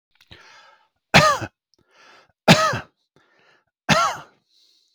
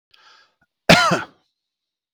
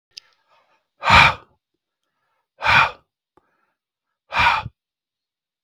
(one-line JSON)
{"three_cough_length": "4.9 s", "three_cough_amplitude": 32768, "three_cough_signal_mean_std_ratio": 0.31, "cough_length": "2.1 s", "cough_amplitude": 32768, "cough_signal_mean_std_ratio": 0.29, "exhalation_length": "5.6 s", "exhalation_amplitude": 32768, "exhalation_signal_mean_std_ratio": 0.29, "survey_phase": "beta (2021-08-13 to 2022-03-07)", "age": "45-64", "gender": "Male", "wearing_mask": "No", "symptom_none": true, "smoker_status": "Ex-smoker", "respiratory_condition_asthma": false, "respiratory_condition_other": false, "recruitment_source": "REACT", "submission_delay": "2 days", "covid_test_result": "Negative", "covid_test_method": "RT-qPCR"}